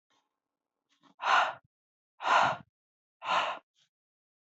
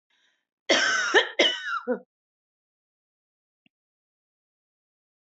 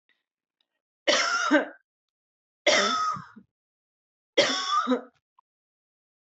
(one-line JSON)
{"exhalation_length": "4.4 s", "exhalation_amplitude": 8192, "exhalation_signal_mean_std_ratio": 0.36, "cough_length": "5.3 s", "cough_amplitude": 17129, "cough_signal_mean_std_ratio": 0.33, "three_cough_length": "6.4 s", "three_cough_amplitude": 15007, "three_cough_signal_mean_std_ratio": 0.42, "survey_phase": "alpha (2021-03-01 to 2021-08-12)", "age": "18-44", "gender": "Female", "wearing_mask": "No", "symptom_none": true, "smoker_status": "Ex-smoker", "respiratory_condition_asthma": false, "respiratory_condition_other": false, "recruitment_source": "REACT", "submission_delay": "7 days", "covid_test_result": "Negative", "covid_test_method": "RT-qPCR"}